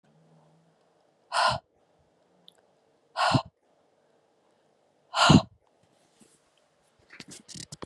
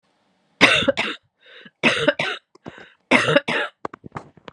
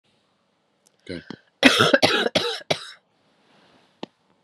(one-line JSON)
{"exhalation_length": "7.9 s", "exhalation_amplitude": 23048, "exhalation_signal_mean_std_ratio": 0.24, "three_cough_length": "4.5 s", "three_cough_amplitude": 32767, "three_cough_signal_mean_std_ratio": 0.42, "cough_length": "4.4 s", "cough_amplitude": 32767, "cough_signal_mean_std_ratio": 0.33, "survey_phase": "beta (2021-08-13 to 2022-03-07)", "age": "45-64", "gender": "Female", "wearing_mask": "No", "symptom_cough_any": true, "symptom_runny_or_blocked_nose": true, "symptom_shortness_of_breath": true, "symptom_sore_throat": true, "symptom_abdominal_pain": true, "symptom_diarrhoea": true, "symptom_fatigue": true, "symptom_headache": true, "symptom_change_to_sense_of_smell_or_taste": true, "symptom_other": true, "symptom_onset": "6 days", "smoker_status": "Ex-smoker", "respiratory_condition_asthma": false, "respiratory_condition_other": false, "recruitment_source": "Test and Trace", "submission_delay": "1 day", "covid_test_result": "Positive", "covid_test_method": "RT-qPCR", "covid_ct_value": 30.3, "covid_ct_gene": "ORF1ab gene"}